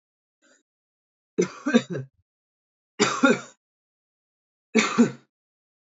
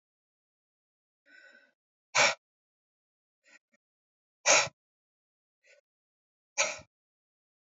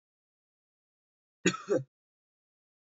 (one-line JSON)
{"three_cough_length": "5.8 s", "three_cough_amplitude": 20970, "three_cough_signal_mean_std_ratio": 0.31, "exhalation_length": "7.8 s", "exhalation_amplitude": 12522, "exhalation_signal_mean_std_ratio": 0.2, "cough_length": "2.9 s", "cough_amplitude": 8948, "cough_signal_mean_std_ratio": 0.21, "survey_phase": "alpha (2021-03-01 to 2021-08-12)", "age": "18-44", "gender": "Male", "wearing_mask": "No", "symptom_none": true, "smoker_status": "Never smoked", "respiratory_condition_asthma": false, "respiratory_condition_other": false, "recruitment_source": "REACT", "submission_delay": "3 days", "covid_test_result": "Negative", "covid_test_method": "RT-qPCR"}